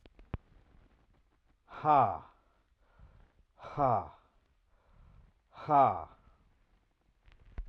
{"exhalation_length": "7.7 s", "exhalation_amplitude": 7118, "exhalation_signal_mean_std_ratio": 0.3, "survey_phase": "alpha (2021-03-01 to 2021-08-12)", "age": "45-64", "gender": "Male", "wearing_mask": "No", "symptom_none": true, "smoker_status": "Ex-smoker", "respiratory_condition_asthma": false, "respiratory_condition_other": false, "recruitment_source": "REACT", "submission_delay": "1 day", "covid_test_result": "Negative", "covid_test_method": "RT-qPCR"}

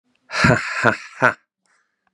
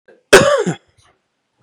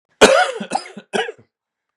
{"exhalation_length": "2.1 s", "exhalation_amplitude": 32767, "exhalation_signal_mean_std_ratio": 0.41, "cough_length": "1.6 s", "cough_amplitude": 32768, "cough_signal_mean_std_ratio": 0.37, "three_cough_length": "2.0 s", "three_cough_amplitude": 32768, "three_cough_signal_mean_std_ratio": 0.39, "survey_phase": "beta (2021-08-13 to 2022-03-07)", "age": "18-44", "gender": "Male", "wearing_mask": "No", "symptom_cough_any": true, "symptom_sore_throat": true, "symptom_onset": "5 days", "smoker_status": "Ex-smoker", "respiratory_condition_asthma": false, "respiratory_condition_other": false, "recruitment_source": "Test and Trace", "submission_delay": "2 days", "covid_test_result": "Negative", "covid_test_method": "RT-qPCR"}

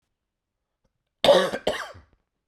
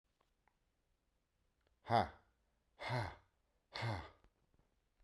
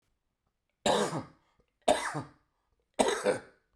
{"cough_length": "2.5 s", "cough_amplitude": 18955, "cough_signal_mean_std_ratio": 0.31, "exhalation_length": "5.0 s", "exhalation_amplitude": 3184, "exhalation_signal_mean_std_ratio": 0.3, "three_cough_length": "3.8 s", "three_cough_amplitude": 12352, "three_cough_signal_mean_std_ratio": 0.4, "survey_phase": "beta (2021-08-13 to 2022-03-07)", "age": "45-64", "gender": "Male", "wearing_mask": "No", "symptom_cough_any": true, "symptom_fatigue": true, "smoker_status": "Never smoked", "respiratory_condition_asthma": false, "respiratory_condition_other": false, "recruitment_source": "Test and Trace", "submission_delay": "2 days", "covid_test_result": "Positive", "covid_test_method": "RT-qPCR", "covid_ct_value": 31.8, "covid_ct_gene": "ORF1ab gene"}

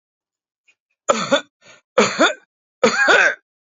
{"three_cough_length": "3.8 s", "three_cough_amplitude": 27762, "three_cough_signal_mean_std_ratio": 0.43, "survey_phase": "beta (2021-08-13 to 2022-03-07)", "age": "45-64", "gender": "Male", "wearing_mask": "No", "symptom_shortness_of_breath": true, "symptom_change_to_sense_of_smell_or_taste": true, "symptom_loss_of_taste": true, "smoker_status": "Never smoked", "respiratory_condition_asthma": false, "respiratory_condition_other": false, "recruitment_source": "REACT", "submission_delay": "1 day", "covid_test_result": "Negative", "covid_test_method": "RT-qPCR", "influenza_a_test_result": "Negative", "influenza_b_test_result": "Negative"}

